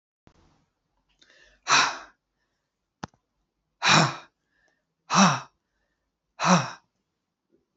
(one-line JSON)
{"exhalation_length": "7.8 s", "exhalation_amplitude": 20408, "exhalation_signal_mean_std_ratio": 0.29, "survey_phase": "beta (2021-08-13 to 2022-03-07)", "age": "65+", "gender": "Female", "wearing_mask": "No", "symptom_none": true, "symptom_onset": "12 days", "smoker_status": "Ex-smoker", "respiratory_condition_asthma": false, "respiratory_condition_other": false, "recruitment_source": "REACT", "submission_delay": "2 days", "covid_test_result": "Negative", "covid_test_method": "RT-qPCR", "influenza_a_test_result": "Negative", "influenza_b_test_result": "Negative"}